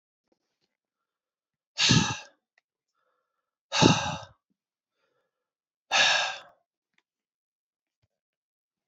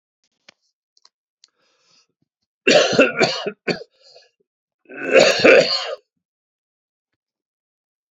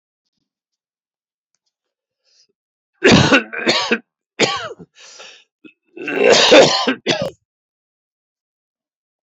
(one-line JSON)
{"exhalation_length": "8.9 s", "exhalation_amplitude": 23442, "exhalation_signal_mean_std_ratio": 0.27, "three_cough_length": "8.1 s", "three_cough_amplitude": 28080, "three_cough_signal_mean_std_ratio": 0.33, "cough_length": "9.3 s", "cough_amplitude": 31900, "cough_signal_mean_std_ratio": 0.36, "survey_phase": "beta (2021-08-13 to 2022-03-07)", "age": "45-64", "gender": "Male", "wearing_mask": "No", "symptom_cough_any": true, "symptom_runny_or_blocked_nose": true, "symptom_sore_throat": true, "symptom_fatigue": true, "symptom_headache": true, "symptom_change_to_sense_of_smell_or_taste": true, "symptom_onset": "4 days", "smoker_status": "Never smoked", "respiratory_condition_asthma": false, "respiratory_condition_other": false, "recruitment_source": "Test and Trace", "submission_delay": "2 days", "covid_test_result": "Positive", "covid_test_method": "LAMP"}